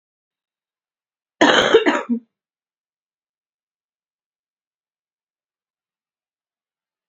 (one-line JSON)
{"cough_length": "7.1 s", "cough_amplitude": 32768, "cough_signal_mean_std_ratio": 0.23, "survey_phase": "beta (2021-08-13 to 2022-03-07)", "age": "18-44", "gender": "Female", "wearing_mask": "No", "symptom_cough_any": true, "symptom_onset": "10 days", "smoker_status": "Never smoked", "respiratory_condition_asthma": false, "respiratory_condition_other": false, "recruitment_source": "REACT", "submission_delay": "13 days", "covid_test_result": "Negative", "covid_test_method": "RT-qPCR", "influenza_a_test_result": "Unknown/Void", "influenza_b_test_result": "Unknown/Void"}